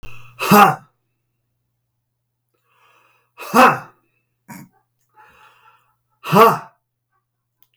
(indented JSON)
{
  "exhalation_length": "7.8 s",
  "exhalation_amplitude": 32768,
  "exhalation_signal_mean_std_ratio": 0.27,
  "survey_phase": "beta (2021-08-13 to 2022-03-07)",
  "age": "65+",
  "gender": "Male",
  "wearing_mask": "No",
  "symptom_none": true,
  "smoker_status": "Ex-smoker",
  "respiratory_condition_asthma": false,
  "respiratory_condition_other": false,
  "recruitment_source": "REACT",
  "submission_delay": "5 days",
  "covid_test_result": "Negative",
  "covid_test_method": "RT-qPCR",
  "influenza_a_test_result": "Negative",
  "influenza_b_test_result": "Negative"
}